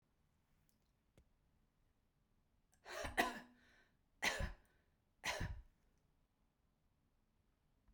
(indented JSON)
{
  "three_cough_length": "7.9 s",
  "three_cough_amplitude": 2796,
  "three_cough_signal_mean_std_ratio": 0.29,
  "survey_phase": "beta (2021-08-13 to 2022-03-07)",
  "age": "45-64",
  "gender": "Female",
  "wearing_mask": "No",
  "symptom_none": true,
  "smoker_status": "Never smoked",
  "respiratory_condition_asthma": false,
  "respiratory_condition_other": false,
  "recruitment_source": "REACT",
  "submission_delay": "1 day",
  "covid_test_result": "Negative",
  "covid_test_method": "RT-qPCR"
}